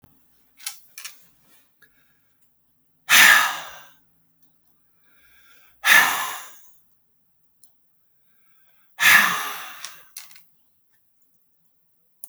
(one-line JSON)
{"exhalation_length": "12.3 s", "exhalation_amplitude": 32768, "exhalation_signal_mean_std_ratio": 0.28, "survey_phase": "alpha (2021-03-01 to 2021-08-12)", "age": "45-64", "gender": "Male", "wearing_mask": "No", "symptom_fatigue": true, "symptom_loss_of_taste": true, "symptom_onset": "8 days", "smoker_status": "Current smoker (11 or more cigarettes per day)", "respiratory_condition_asthma": false, "respiratory_condition_other": false, "recruitment_source": "REACT", "submission_delay": "3 days", "covid_test_result": "Negative", "covid_test_method": "RT-qPCR"}